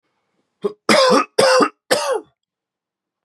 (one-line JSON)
{"three_cough_length": "3.2 s", "three_cough_amplitude": 30505, "three_cough_signal_mean_std_ratio": 0.46, "survey_phase": "beta (2021-08-13 to 2022-03-07)", "age": "18-44", "gender": "Male", "wearing_mask": "No", "symptom_cough_any": true, "symptom_runny_or_blocked_nose": true, "symptom_fatigue": true, "symptom_headache": true, "smoker_status": "Current smoker (e-cigarettes or vapes only)", "respiratory_condition_asthma": true, "respiratory_condition_other": false, "recruitment_source": "Test and Trace", "submission_delay": "1 day", "covid_test_result": "Positive", "covid_test_method": "LFT"}